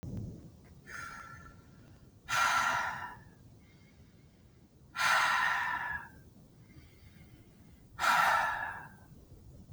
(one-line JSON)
{"exhalation_length": "9.7 s", "exhalation_amplitude": 5466, "exhalation_signal_mean_std_ratio": 0.51, "survey_phase": "beta (2021-08-13 to 2022-03-07)", "age": "45-64", "gender": "Male", "wearing_mask": "No", "symptom_none": true, "smoker_status": "Ex-smoker", "respiratory_condition_asthma": false, "respiratory_condition_other": false, "recruitment_source": "REACT", "submission_delay": "3 days", "covid_test_result": "Negative", "covid_test_method": "RT-qPCR"}